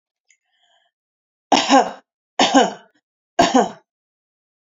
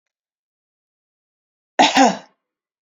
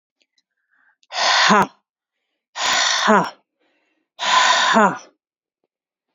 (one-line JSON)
{"three_cough_length": "4.6 s", "three_cough_amplitude": 29944, "three_cough_signal_mean_std_ratio": 0.34, "cough_length": "2.8 s", "cough_amplitude": 27958, "cough_signal_mean_std_ratio": 0.27, "exhalation_length": "6.1 s", "exhalation_amplitude": 29168, "exhalation_signal_mean_std_ratio": 0.46, "survey_phase": "alpha (2021-03-01 to 2021-08-12)", "age": "18-44", "gender": "Female", "wearing_mask": "No", "symptom_none": true, "smoker_status": "Never smoked", "respiratory_condition_asthma": false, "respiratory_condition_other": false, "recruitment_source": "REACT", "submission_delay": "1 day", "covid_test_result": "Negative", "covid_test_method": "RT-qPCR"}